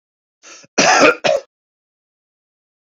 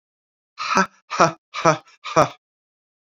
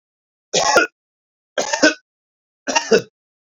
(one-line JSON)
{"cough_length": "2.8 s", "cough_amplitude": 29481, "cough_signal_mean_std_ratio": 0.35, "exhalation_length": "3.1 s", "exhalation_amplitude": 29154, "exhalation_signal_mean_std_ratio": 0.34, "three_cough_length": "3.5 s", "three_cough_amplitude": 31234, "three_cough_signal_mean_std_ratio": 0.38, "survey_phase": "beta (2021-08-13 to 2022-03-07)", "age": "18-44", "gender": "Male", "wearing_mask": "No", "symptom_none": true, "smoker_status": "Never smoked", "respiratory_condition_asthma": true, "respiratory_condition_other": false, "recruitment_source": "REACT", "submission_delay": "0 days", "covid_test_result": "Negative", "covid_test_method": "RT-qPCR"}